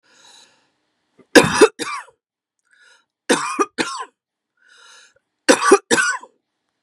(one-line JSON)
{"three_cough_length": "6.8 s", "three_cough_amplitude": 32768, "three_cough_signal_mean_std_ratio": 0.31, "survey_phase": "beta (2021-08-13 to 2022-03-07)", "age": "45-64", "gender": "Female", "wearing_mask": "No", "symptom_none": true, "smoker_status": "Ex-smoker", "respiratory_condition_asthma": false, "respiratory_condition_other": false, "recruitment_source": "REACT", "submission_delay": "2 days", "covid_test_result": "Negative", "covid_test_method": "RT-qPCR", "influenza_a_test_result": "Negative", "influenza_b_test_result": "Negative"}